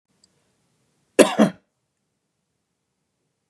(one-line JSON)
{"cough_length": "3.5 s", "cough_amplitude": 32768, "cough_signal_mean_std_ratio": 0.18, "survey_phase": "beta (2021-08-13 to 2022-03-07)", "age": "45-64", "gender": "Male", "wearing_mask": "No", "symptom_none": true, "smoker_status": "Never smoked", "respiratory_condition_asthma": false, "respiratory_condition_other": false, "recruitment_source": "REACT", "submission_delay": "1 day", "covid_test_result": "Negative", "covid_test_method": "RT-qPCR", "influenza_a_test_result": "Negative", "influenza_b_test_result": "Negative"}